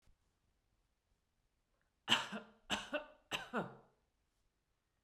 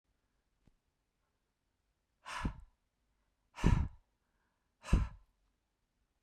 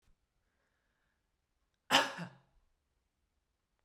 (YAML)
three_cough_length: 5.0 s
three_cough_amplitude: 5282
three_cough_signal_mean_std_ratio: 0.29
exhalation_length: 6.2 s
exhalation_amplitude: 5729
exhalation_signal_mean_std_ratio: 0.24
cough_length: 3.8 s
cough_amplitude: 7846
cough_signal_mean_std_ratio: 0.19
survey_phase: beta (2021-08-13 to 2022-03-07)
age: 45-64
gender: Female
wearing_mask: 'No'
symptom_none: true
smoker_status: Ex-smoker
respiratory_condition_asthma: false
respiratory_condition_other: false
recruitment_source: REACT
submission_delay: 2 days
covid_test_result: Negative
covid_test_method: RT-qPCR